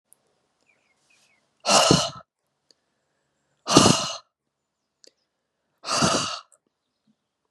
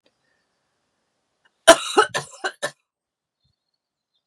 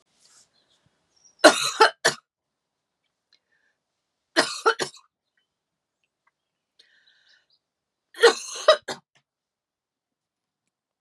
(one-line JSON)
{"exhalation_length": "7.5 s", "exhalation_amplitude": 32274, "exhalation_signal_mean_std_ratio": 0.3, "cough_length": "4.3 s", "cough_amplitude": 32768, "cough_signal_mean_std_ratio": 0.19, "three_cough_length": "11.0 s", "three_cough_amplitude": 32654, "three_cough_signal_mean_std_ratio": 0.21, "survey_phase": "beta (2021-08-13 to 2022-03-07)", "age": "45-64", "gender": "Female", "wearing_mask": "No", "symptom_cough_any": true, "symptom_runny_or_blocked_nose": true, "symptom_sore_throat": true, "symptom_fatigue": true, "symptom_headache": true, "symptom_onset": "3 days", "smoker_status": "Ex-smoker", "respiratory_condition_asthma": false, "respiratory_condition_other": false, "recruitment_source": "Test and Trace", "submission_delay": "2 days", "covid_test_result": "Positive", "covid_test_method": "RT-qPCR", "covid_ct_value": 27.3, "covid_ct_gene": "N gene", "covid_ct_mean": 27.4, "covid_viral_load": "1000 copies/ml", "covid_viral_load_category": "Minimal viral load (< 10K copies/ml)"}